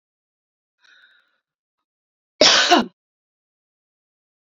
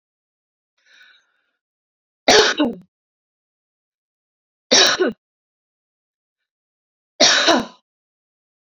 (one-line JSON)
{"cough_length": "4.4 s", "cough_amplitude": 32315, "cough_signal_mean_std_ratio": 0.24, "three_cough_length": "8.8 s", "three_cough_amplitude": 32768, "three_cough_signal_mean_std_ratio": 0.29, "survey_phase": "beta (2021-08-13 to 2022-03-07)", "age": "45-64", "gender": "Female", "wearing_mask": "No", "symptom_none": true, "smoker_status": "Ex-smoker", "respiratory_condition_asthma": false, "respiratory_condition_other": false, "recruitment_source": "REACT", "submission_delay": "1 day", "covid_test_result": "Negative", "covid_test_method": "RT-qPCR"}